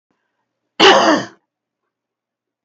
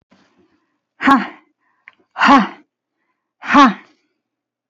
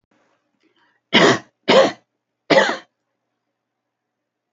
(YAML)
cough_length: 2.6 s
cough_amplitude: 32768
cough_signal_mean_std_ratio: 0.32
exhalation_length: 4.7 s
exhalation_amplitude: 31112
exhalation_signal_mean_std_ratio: 0.32
three_cough_length: 4.5 s
three_cough_amplitude: 29304
three_cough_signal_mean_std_ratio: 0.31
survey_phase: alpha (2021-03-01 to 2021-08-12)
age: 45-64
gender: Female
wearing_mask: 'No'
symptom_cough_any: true
symptom_diarrhoea: true
symptom_fatigue: true
symptom_headache: true
smoker_status: Never smoked
respiratory_condition_asthma: false
respiratory_condition_other: false
recruitment_source: REACT
submission_delay: 2 days
covid_test_result: Negative
covid_test_method: RT-qPCR